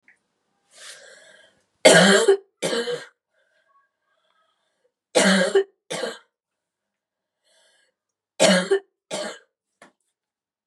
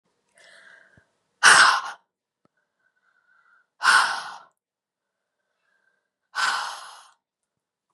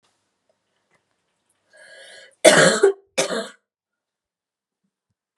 {"three_cough_length": "10.7 s", "three_cough_amplitude": 32707, "three_cough_signal_mean_std_ratio": 0.32, "exhalation_length": "7.9 s", "exhalation_amplitude": 29711, "exhalation_signal_mean_std_ratio": 0.28, "cough_length": "5.4 s", "cough_amplitude": 32768, "cough_signal_mean_std_ratio": 0.26, "survey_phase": "beta (2021-08-13 to 2022-03-07)", "age": "18-44", "gender": "Female", "wearing_mask": "No", "symptom_cough_any": true, "symptom_runny_or_blocked_nose": true, "symptom_sore_throat": true, "symptom_onset": "2 days", "smoker_status": "Never smoked", "respiratory_condition_asthma": false, "respiratory_condition_other": false, "recruitment_source": "Test and Trace", "submission_delay": "1 day", "covid_test_result": "Negative", "covid_test_method": "LAMP"}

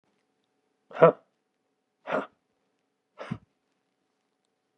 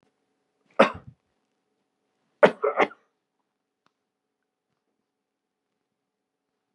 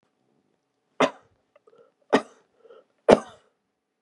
{"exhalation_length": "4.8 s", "exhalation_amplitude": 23377, "exhalation_signal_mean_std_ratio": 0.16, "cough_length": "6.7 s", "cough_amplitude": 27093, "cough_signal_mean_std_ratio": 0.16, "three_cough_length": "4.0 s", "three_cough_amplitude": 32768, "three_cough_signal_mean_std_ratio": 0.18, "survey_phase": "beta (2021-08-13 to 2022-03-07)", "age": "65+", "gender": "Male", "wearing_mask": "No", "symptom_none": true, "symptom_onset": "12 days", "smoker_status": "Ex-smoker", "respiratory_condition_asthma": false, "respiratory_condition_other": false, "recruitment_source": "REACT", "submission_delay": "2 days", "covid_test_result": "Negative", "covid_test_method": "RT-qPCR", "influenza_a_test_result": "Negative", "influenza_b_test_result": "Negative"}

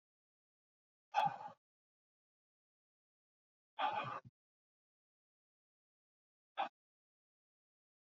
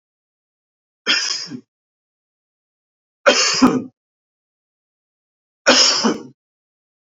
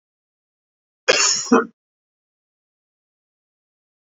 {"exhalation_length": "8.2 s", "exhalation_amplitude": 2388, "exhalation_signal_mean_std_ratio": 0.23, "three_cough_length": "7.2 s", "three_cough_amplitude": 30115, "three_cough_signal_mean_std_ratio": 0.34, "cough_length": "4.1 s", "cough_amplitude": 28705, "cough_signal_mean_std_ratio": 0.26, "survey_phase": "beta (2021-08-13 to 2022-03-07)", "age": "45-64", "gender": "Male", "wearing_mask": "No", "symptom_cough_any": true, "symptom_sore_throat": true, "symptom_fatigue": true, "symptom_fever_high_temperature": true, "symptom_headache": true, "smoker_status": "Ex-smoker", "respiratory_condition_asthma": false, "respiratory_condition_other": false, "recruitment_source": "Test and Trace", "submission_delay": "0 days", "covid_test_result": "Positive", "covid_test_method": "LFT"}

